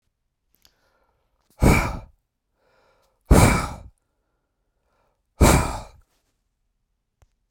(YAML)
exhalation_length: 7.5 s
exhalation_amplitude: 28327
exhalation_signal_mean_std_ratio: 0.28
survey_phase: beta (2021-08-13 to 2022-03-07)
age: 45-64
gender: Male
wearing_mask: 'No'
symptom_none: true
smoker_status: Never smoked
respiratory_condition_asthma: false
respiratory_condition_other: false
recruitment_source: REACT
submission_delay: 1 day
covid_test_result: Negative
covid_test_method: RT-qPCR
influenza_a_test_result: Negative
influenza_b_test_result: Negative